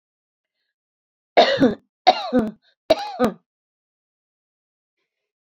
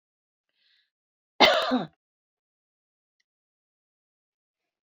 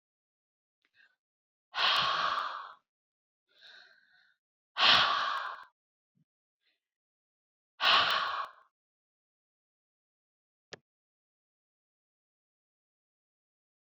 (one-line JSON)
{"three_cough_length": "5.5 s", "three_cough_amplitude": 27953, "three_cough_signal_mean_std_ratio": 0.3, "cough_length": "4.9 s", "cough_amplitude": 24572, "cough_signal_mean_std_ratio": 0.21, "exhalation_length": "13.9 s", "exhalation_amplitude": 10710, "exhalation_signal_mean_std_ratio": 0.3, "survey_phase": "beta (2021-08-13 to 2022-03-07)", "age": "65+", "gender": "Female", "wearing_mask": "No", "symptom_none": true, "smoker_status": "Ex-smoker", "respiratory_condition_asthma": false, "respiratory_condition_other": false, "recruitment_source": "REACT", "submission_delay": "1 day", "covid_test_result": "Negative", "covid_test_method": "RT-qPCR"}